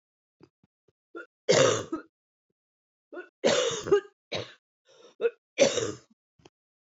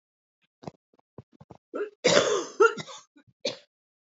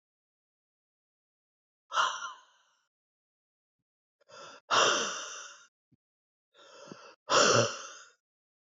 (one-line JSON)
{"three_cough_length": "6.9 s", "three_cough_amplitude": 13928, "three_cough_signal_mean_std_ratio": 0.35, "cough_length": "4.1 s", "cough_amplitude": 25426, "cough_signal_mean_std_ratio": 0.33, "exhalation_length": "8.7 s", "exhalation_amplitude": 9578, "exhalation_signal_mean_std_ratio": 0.31, "survey_phase": "beta (2021-08-13 to 2022-03-07)", "age": "45-64", "gender": "Female", "wearing_mask": "No", "symptom_cough_any": true, "symptom_runny_or_blocked_nose": true, "symptom_sore_throat": true, "symptom_fatigue": true, "symptom_headache": true, "symptom_other": true, "smoker_status": "Never smoked", "respiratory_condition_asthma": false, "respiratory_condition_other": false, "recruitment_source": "Test and Trace", "submission_delay": "1 day", "covid_test_result": "Positive", "covid_test_method": "LFT"}